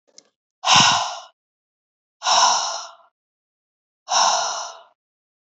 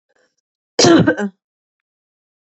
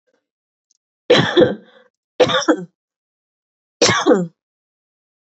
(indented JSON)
{
  "exhalation_length": "5.5 s",
  "exhalation_amplitude": 27579,
  "exhalation_signal_mean_std_ratio": 0.42,
  "cough_length": "2.6 s",
  "cough_amplitude": 31589,
  "cough_signal_mean_std_ratio": 0.33,
  "three_cough_length": "5.2 s",
  "three_cough_amplitude": 32379,
  "three_cough_signal_mean_std_ratio": 0.37,
  "survey_phase": "beta (2021-08-13 to 2022-03-07)",
  "age": "18-44",
  "gender": "Female",
  "wearing_mask": "No",
  "symptom_headache": true,
  "smoker_status": "Never smoked",
  "respiratory_condition_asthma": true,
  "respiratory_condition_other": false,
  "recruitment_source": "REACT",
  "submission_delay": "0 days",
  "covid_test_result": "Negative",
  "covid_test_method": "RT-qPCR",
  "influenza_a_test_result": "Negative",
  "influenza_b_test_result": "Negative"
}